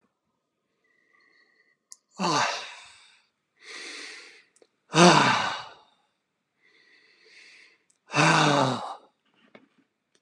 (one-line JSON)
{"exhalation_length": "10.2 s", "exhalation_amplitude": 24201, "exhalation_signal_mean_std_ratio": 0.33, "survey_phase": "beta (2021-08-13 to 2022-03-07)", "age": "65+", "gender": "Male", "wearing_mask": "No", "symptom_none": true, "smoker_status": "Never smoked", "respiratory_condition_asthma": false, "respiratory_condition_other": false, "recruitment_source": "REACT", "submission_delay": "1 day", "covid_test_result": "Negative", "covid_test_method": "RT-qPCR", "influenza_a_test_result": "Negative", "influenza_b_test_result": "Negative"}